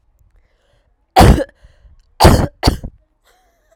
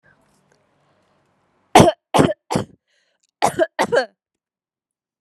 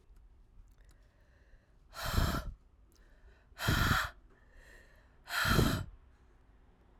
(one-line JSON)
{"three_cough_length": "3.8 s", "three_cough_amplitude": 32768, "three_cough_signal_mean_std_ratio": 0.33, "cough_length": "5.2 s", "cough_amplitude": 32768, "cough_signal_mean_std_ratio": 0.29, "exhalation_length": "7.0 s", "exhalation_amplitude": 6442, "exhalation_signal_mean_std_ratio": 0.41, "survey_phase": "alpha (2021-03-01 to 2021-08-12)", "age": "18-44", "gender": "Female", "wearing_mask": "No", "symptom_headache": true, "symptom_change_to_sense_of_smell_or_taste": true, "symptom_loss_of_taste": true, "symptom_onset": "2 days", "smoker_status": "Prefer not to say", "respiratory_condition_asthma": false, "respiratory_condition_other": false, "recruitment_source": "Test and Trace", "submission_delay": "2 days", "covid_test_result": "Positive", "covid_test_method": "RT-qPCR", "covid_ct_value": 13.0, "covid_ct_gene": "ORF1ab gene", "covid_ct_mean": 13.3, "covid_viral_load": "45000000 copies/ml", "covid_viral_load_category": "High viral load (>1M copies/ml)"}